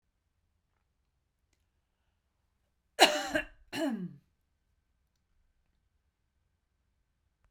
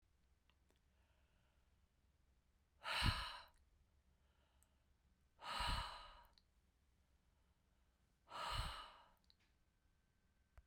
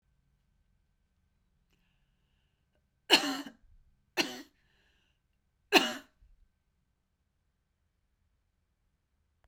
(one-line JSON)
{"cough_length": "7.5 s", "cough_amplitude": 16038, "cough_signal_mean_std_ratio": 0.2, "exhalation_length": "10.7 s", "exhalation_amplitude": 1766, "exhalation_signal_mean_std_ratio": 0.33, "three_cough_length": "9.5 s", "three_cough_amplitude": 13340, "three_cough_signal_mean_std_ratio": 0.18, "survey_phase": "beta (2021-08-13 to 2022-03-07)", "age": "45-64", "gender": "Female", "wearing_mask": "No", "symptom_none": true, "smoker_status": "Ex-smoker", "respiratory_condition_asthma": false, "respiratory_condition_other": false, "recruitment_source": "REACT", "submission_delay": "1 day", "covid_test_result": "Negative", "covid_test_method": "RT-qPCR", "influenza_a_test_result": "Negative", "influenza_b_test_result": "Negative"}